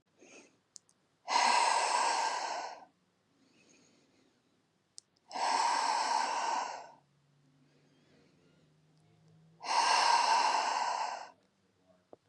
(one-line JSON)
{"exhalation_length": "12.3 s", "exhalation_amplitude": 5254, "exhalation_signal_mean_std_ratio": 0.52, "survey_phase": "beta (2021-08-13 to 2022-03-07)", "age": "18-44", "gender": "Female", "wearing_mask": "No", "symptom_none": true, "smoker_status": "Never smoked", "respiratory_condition_asthma": false, "respiratory_condition_other": false, "recruitment_source": "REACT", "submission_delay": "2 days", "covid_test_result": "Negative", "covid_test_method": "RT-qPCR", "influenza_a_test_result": "Negative", "influenza_b_test_result": "Negative"}